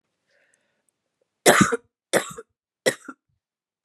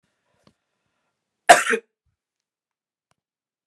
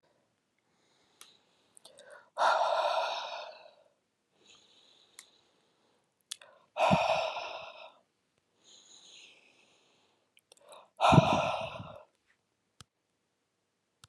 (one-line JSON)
{"three_cough_length": "3.8 s", "three_cough_amplitude": 32714, "three_cough_signal_mean_std_ratio": 0.26, "cough_length": "3.7 s", "cough_amplitude": 32768, "cough_signal_mean_std_ratio": 0.16, "exhalation_length": "14.1 s", "exhalation_amplitude": 12149, "exhalation_signal_mean_std_ratio": 0.32, "survey_phase": "beta (2021-08-13 to 2022-03-07)", "age": "18-44", "gender": "Female", "wearing_mask": "No", "symptom_cough_any": true, "symptom_new_continuous_cough": true, "symptom_runny_or_blocked_nose": true, "symptom_onset": "4 days", "smoker_status": "Current smoker (1 to 10 cigarettes per day)", "respiratory_condition_asthma": false, "respiratory_condition_other": false, "recruitment_source": "REACT", "submission_delay": "2 days", "covid_test_result": "Negative", "covid_test_method": "RT-qPCR", "influenza_a_test_result": "Negative", "influenza_b_test_result": "Negative"}